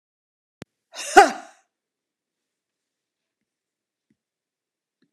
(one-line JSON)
{"cough_length": "5.1 s", "cough_amplitude": 32767, "cough_signal_mean_std_ratio": 0.14, "survey_phase": "alpha (2021-03-01 to 2021-08-12)", "age": "65+", "gender": "Female", "wearing_mask": "No", "symptom_none": true, "smoker_status": "Ex-smoker", "respiratory_condition_asthma": false, "respiratory_condition_other": false, "recruitment_source": "REACT", "submission_delay": "2 days", "covid_test_result": "Negative", "covid_test_method": "RT-qPCR"}